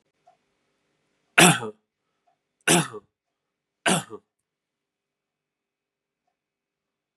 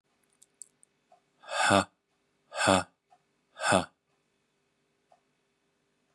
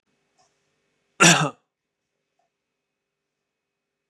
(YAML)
three_cough_length: 7.2 s
three_cough_amplitude: 29766
three_cough_signal_mean_std_ratio: 0.21
exhalation_length: 6.1 s
exhalation_amplitude: 15311
exhalation_signal_mean_std_ratio: 0.27
cough_length: 4.1 s
cough_amplitude: 31476
cough_signal_mean_std_ratio: 0.19
survey_phase: beta (2021-08-13 to 2022-03-07)
age: 45-64
gender: Male
wearing_mask: 'No'
symptom_cough_any: true
symptom_runny_or_blocked_nose: true
symptom_onset: 10 days
smoker_status: Never smoked
respiratory_condition_asthma: false
respiratory_condition_other: false
recruitment_source: REACT
submission_delay: 5 days
covid_test_result: Negative
covid_test_method: RT-qPCR
influenza_a_test_result: Unknown/Void
influenza_b_test_result: Unknown/Void